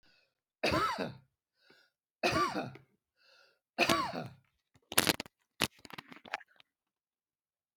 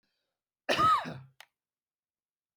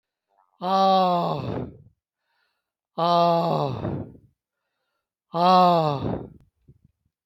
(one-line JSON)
{"three_cough_length": "7.8 s", "three_cough_amplitude": 25160, "three_cough_signal_mean_std_ratio": 0.34, "cough_length": "2.6 s", "cough_amplitude": 8505, "cough_signal_mean_std_ratio": 0.33, "exhalation_length": "7.3 s", "exhalation_amplitude": 20151, "exhalation_signal_mean_std_ratio": 0.51, "survey_phase": "alpha (2021-03-01 to 2021-08-12)", "age": "65+", "gender": "Male", "wearing_mask": "No", "symptom_none": true, "smoker_status": "Never smoked", "respiratory_condition_asthma": false, "respiratory_condition_other": false, "recruitment_source": "REACT", "submission_delay": "8 days", "covid_test_result": "Negative", "covid_test_method": "RT-qPCR"}